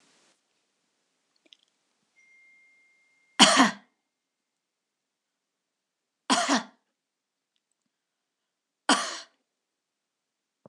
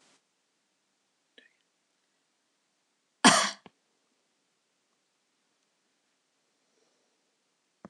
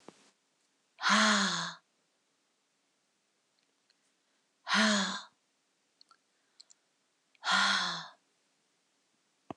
{"three_cough_length": "10.7 s", "three_cough_amplitude": 26028, "three_cough_signal_mean_std_ratio": 0.2, "cough_length": "7.9 s", "cough_amplitude": 17625, "cough_signal_mean_std_ratio": 0.13, "exhalation_length": "9.6 s", "exhalation_amplitude": 7790, "exhalation_signal_mean_std_ratio": 0.34, "survey_phase": "beta (2021-08-13 to 2022-03-07)", "age": "45-64", "gender": "Female", "wearing_mask": "No", "symptom_none": true, "smoker_status": "Never smoked", "respiratory_condition_asthma": false, "respiratory_condition_other": false, "recruitment_source": "REACT", "submission_delay": "6 days", "covid_test_result": "Negative", "covid_test_method": "RT-qPCR"}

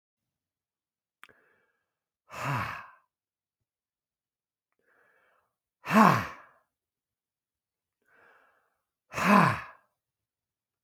{"exhalation_length": "10.8 s", "exhalation_amplitude": 18822, "exhalation_signal_mean_std_ratio": 0.23, "survey_phase": "beta (2021-08-13 to 2022-03-07)", "age": "45-64", "gender": "Male", "wearing_mask": "No", "symptom_none": true, "smoker_status": "Ex-smoker", "respiratory_condition_asthma": false, "respiratory_condition_other": false, "recruitment_source": "REACT", "submission_delay": "1 day", "covid_test_result": "Negative", "covid_test_method": "RT-qPCR", "influenza_a_test_result": "Negative", "influenza_b_test_result": "Negative"}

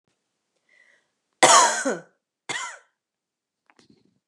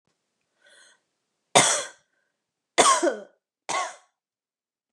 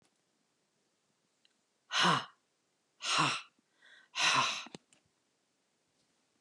{"cough_length": "4.3 s", "cough_amplitude": 30334, "cough_signal_mean_std_ratio": 0.27, "three_cough_length": "4.9 s", "three_cough_amplitude": 28782, "three_cough_signal_mean_std_ratio": 0.3, "exhalation_length": "6.4 s", "exhalation_amplitude": 5608, "exhalation_signal_mean_std_ratio": 0.34, "survey_phase": "beta (2021-08-13 to 2022-03-07)", "age": "45-64", "gender": "Female", "wearing_mask": "No", "symptom_runny_or_blocked_nose": true, "symptom_sore_throat": true, "symptom_fatigue": true, "symptom_headache": true, "symptom_onset": "12 days", "smoker_status": "Never smoked", "respiratory_condition_asthma": false, "respiratory_condition_other": false, "recruitment_source": "REACT", "submission_delay": "4 days", "covid_test_result": "Negative", "covid_test_method": "RT-qPCR", "influenza_a_test_result": "Negative", "influenza_b_test_result": "Negative"}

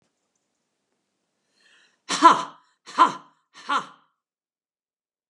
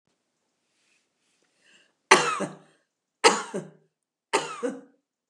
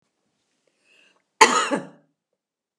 {"exhalation_length": "5.3 s", "exhalation_amplitude": 31534, "exhalation_signal_mean_std_ratio": 0.23, "three_cough_length": "5.3 s", "three_cough_amplitude": 32489, "three_cough_signal_mean_std_ratio": 0.26, "cough_length": "2.8 s", "cough_amplitude": 32768, "cough_signal_mean_std_ratio": 0.24, "survey_phase": "beta (2021-08-13 to 2022-03-07)", "age": "65+", "gender": "Female", "wearing_mask": "No", "symptom_none": true, "smoker_status": "Never smoked", "respiratory_condition_asthma": false, "respiratory_condition_other": false, "recruitment_source": "REACT", "submission_delay": "1 day", "covid_test_result": "Negative", "covid_test_method": "RT-qPCR", "influenza_a_test_result": "Negative", "influenza_b_test_result": "Negative"}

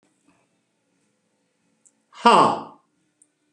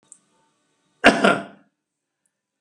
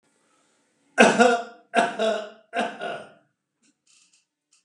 {"exhalation_length": "3.5 s", "exhalation_amplitude": 30888, "exhalation_signal_mean_std_ratio": 0.24, "cough_length": "2.6 s", "cough_amplitude": 32768, "cough_signal_mean_std_ratio": 0.25, "three_cough_length": "4.6 s", "three_cough_amplitude": 32373, "three_cough_signal_mean_std_ratio": 0.36, "survey_phase": "beta (2021-08-13 to 2022-03-07)", "age": "65+", "gender": "Male", "wearing_mask": "No", "symptom_none": true, "smoker_status": "Ex-smoker", "respiratory_condition_asthma": false, "respiratory_condition_other": false, "recruitment_source": "REACT", "submission_delay": "3 days", "covid_test_result": "Negative", "covid_test_method": "RT-qPCR"}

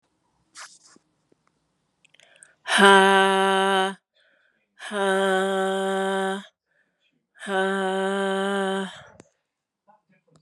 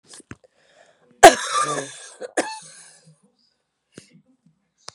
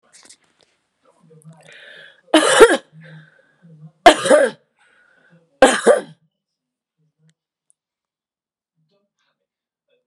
{"exhalation_length": "10.4 s", "exhalation_amplitude": 31838, "exhalation_signal_mean_std_ratio": 0.45, "cough_length": "4.9 s", "cough_amplitude": 32768, "cough_signal_mean_std_ratio": 0.21, "three_cough_length": "10.1 s", "three_cough_amplitude": 32768, "three_cough_signal_mean_std_ratio": 0.26, "survey_phase": "beta (2021-08-13 to 2022-03-07)", "age": "45-64", "gender": "Female", "wearing_mask": "No", "symptom_cough_any": true, "symptom_runny_or_blocked_nose": true, "symptom_sore_throat": true, "symptom_fatigue": true, "symptom_headache": true, "symptom_onset": "5 days", "smoker_status": "Never smoked", "respiratory_condition_asthma": false, "respiratory_condition_other": false, "recruitment_source": "Test and Trace", "submission_delay": "1 day", "covid_test_result": "Positive", "covid_test_method": "RT-qPCR", "covid_ct_value": 18.5, "covid_ct_gene": "ORF1ab gene"}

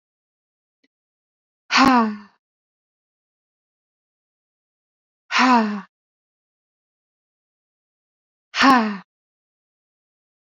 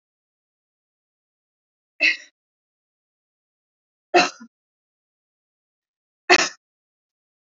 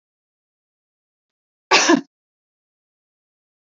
{"exhalation_length": "10.5 s", "exhalation_amplitude": 28127, "exhalation_signal_mean_std_ratio": 0.27, "three_cough_length": "7.6 s", "three_cough_amplitude": 29572, "three_cough_signal_mean_std_ratio": 0.18, "cough_length": "3.7 s", "cough_amplitude": 30577, "cough_signal_mean_std_ratio": 0.21, "survey_phase": "beta (2021-08-13 to 2022-03-07)", "age": "18-44", "gender": "Female", "wearing_mask": "No", "symptom_none": true, "smoker_status": "Never smoked", "respiratory_condition_asthma": false, "respiratory_condition_other": false, "recruitment_source": "REACT", "submission_delay": "1 day", "covid_test_result": "Negative", "covid_test_method": "RT-qPCR", "influenza_a_test_result": "Unknown/Void", "influenza_b_test_result": "Unknown/Void"}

